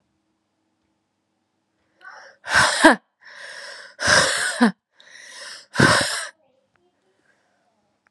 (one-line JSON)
{"exhalation_length": "8.1 s", "exhalation_amplitude": 32767, "exhalation_signal_mean_std_ratio": 0.34, "survey_phase": "alpha (2021-03-01 to 2021-08-12)", "age": "18-44", "gender": "Female", "wearing_mask": "No", "symptom_cough_any": true, "symptom_new_continuous_cough": true, "symptom_shortness_of_breath": true, "symptom_fatigue": true, "symptom_fever_high_temperature": true, "symptom_headache": true, "symptom_change_to_sense_of_smell_or_taste": true, "symptom_onset": "3 days", "smoker_status": "Never smoked", "respiratory_condition_asthma": true, "respiratory_condition_other": false, "recruitment_source": "Test and Trace", "submission_delay": "2 days", "covid_test_result": "Positive", "covid_test_method": "RT-qPCR", "covid_ct_value": 12.6, "covid_ct_gene": "N gene", "covid_ct_mean": 13.6, "covid_viral_load": "34000000 copies/ml", "covid_viral_load_category": "High viral load (>1M copies/ml)"}